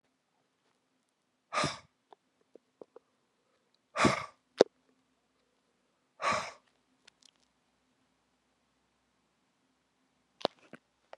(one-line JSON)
{"exhalation_length": "11.2 s", "exhalation_amplitude": 19285, "exhalation_signal_mean_std_ratio": 0.17, "survey_phase": "beta (2021-08-13 to 2022-03-07)", "age": "45-64", "gender": "Male", "wearing_mask": "No", "symptom_cough_any": true, "symptom_runny_or_blocked_nose": true, "symptom_sore_throat": true, "symptom_fatigue": true, "symptom_headache": true, "symptom_onset": "4 days", "smoker_status": "Never smoked", "respiratory_condition_asthma": false, "respiratory_condition_other": false, "recruitment_source": "Test and Trace", "submission_delay": "2 days", "covid_test_result": "Positive", "covid_test_method": "RT-qPCR"}